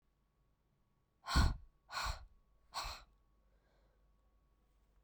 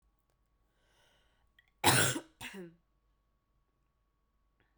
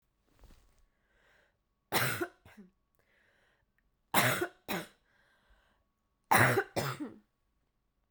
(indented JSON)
{
  "exhalation_length": "5.0 s",
  "exhalation_amplitude": 3625,
  "exhalation_signal_mean_std_ratio": 0.28,
  "cough_length": "4.8 s",
  "cough_amplitude": 9331,
  "cough_signal_mean_std_ratio": 0.23,
  "three_cough_length": "8.1 s",
  "three_cough_amplitude": 9806,
  "three_cough_signal_mean_std_ratio": 0.31,
  "survey_phase": "beta (2021-08-13 to 2022-03-07)",
  "age": "18-44",
  "gender": "Female",
  "wearing_mask": "No",
  "symptom_cough_any": true,
  "symptom_runny_or_blocked_nose": true,
  "symptom_sore_throat": true,
  "symptom_abdominal_pain": true,
  "symptom_fatigue": true,
  "symptom_headache": true,
  "symptom_change_to_sense_of_smell_or_taste": true,
  "symptom_onset": "5 days",
  "smoker_status": "Ex-smoker",
  "respiratory_condition_asthma": false,
  "respiratory_condition_other": false,
  "recruitment_source": "Test and Trace",
  "submission_delay": "2 days",
  "covid_test_result": "Positive",
  "covid_test_method": "ePCR"
}